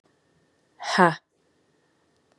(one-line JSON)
{"exhalation_length": "2.4 s", "exhalation_amplitude": 27621, "exhalation_signal_mean_std_ratio": 0.22, "survey_phase": "beta (2021-08-13 to 2022-03-07)", "age": "18-44", "gender": "Female", "wearing_mask": "No", "symptom_none": true, "symptom_onset": "3 days", "smoker_status": "Never smoked", "respiratory_condition_asthma": false, "respiratory_condition_other": false, "recruitment_source": "Test and Trace", "submission_delay": "2 days", "covid_test_result": "Positive", "covid_test_method": "RT-qPCR", "covid_ct_value": 19.3, "covid_ct_gene": "ORF1ab gene", "covid_ct_mean": 19.8, "covid_viral_load": "330000 copies/ml", "covid_viral_load_category": "Low viral load (10K-1M copies/ml)"}